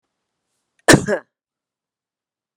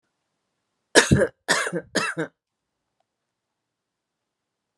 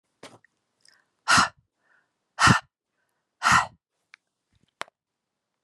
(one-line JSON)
{"cough_length": "2.6 s", "cough_amplitude": 32768, "cough_signal_mean_std_ratio": 0.2, "three_cough_length": "4.8 s", "three_cough_amplitude": 32403, "three_cough_signal_mean_std_ratio": 0.28, "exhalation_length": "5.6 s", "exhalation_amplitude": 19427, "exhalation_signal_mean_std_ratio": 0.26, "survey_phase": "beta (2021-08-13 to 2022-03-07)", "age": "45-64", "gender": "Female", "wearing_mask": "No", "symptom_none": true, "smoker_status": "Never smoked", "respiratory_condition_asthma": false, "respiratory_condition_other": false, "recruitment_source": "REACT", "submission_delay": "3 days", "covid_test_result": "Negative", "covid_test_method": "RT-qPCR"}